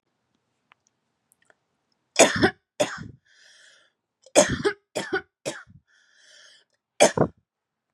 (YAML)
three_cough_length: 7.9 s
three_cough_amplitude: 31257
three_cough_signal_mean_std_ratio: 0.27
survey_phase: beta (2021-08-13 to 2022-03-07)
age: 18-44
gender: Female
wearing_mask: 'No'
symptom_runny_or_blocked_nose: true
symptom_shortness_of_breath: true
symptom_sore_throat: true
symptom_fatigue: true
symptom_headache: true
symptom_onset: 4 days
smoker_status: Never smoked
respiratory_condition_asthma: true
respiratory_condition_other: false
recruitment_source: Test and Trace
submission_delay: 1 day
covid_test_result: Positive
covid_test_method: RT-qPCR
covid_ct_value: 29.2
covid_ct_gene: ORF1ab gene
covid_ct_mean: 29.2
covid_viral_load: 260 copies/ml
covid_viral_load_category: Minimal viral load (< 10K copies/ml)